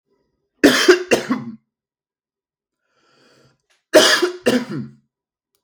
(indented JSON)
{
  "cough_length": "5.6 s",
  "cough_amplitude": 32768,
  "cough_signal_mean_std_ratio": 0.35,
  "survey_phase": "beta (2021-08-13 to 2022-03-07)",
  "age": "18-44",
  "gender": "Male",
  "wearing_mask": "No",
  "symptom_none": true,
  "smoker_status": "Never smoked",
  "respiratory_condition_asthma": false,
  "respiratory_condition_other": false,
  "recruitment_source": "REACT",
  "submission_delay": "1 day",
  "covid_test_result": "Negative",
  "covid_test_method": "RT-qPCR",
  "influenza_a_test_result": "Negative",
  "influenza_b_test_result": "Negative"
}